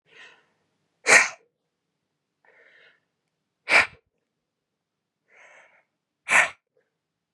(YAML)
exhalation_length: 7.3 s
exhalation_amplitude: 29741
exhalation_signal_mean_std_ratio: 0.21
survey_phase: beta (2021-08-13 to 2022-03-07)
age: 18-44
gender: Female
wearing_mask: 'No'
symptom_none: true
smoker_status: Never smoked
respiratory_condition_asthma: false
respiratory_condition_other: false
recruitment_source: REACT
submission_delay: 1 day
covid_test_result: Negative
covid_test_method: RT-qPCR
influenza_a_test_result: Negative
influenza_b_test_result: Negative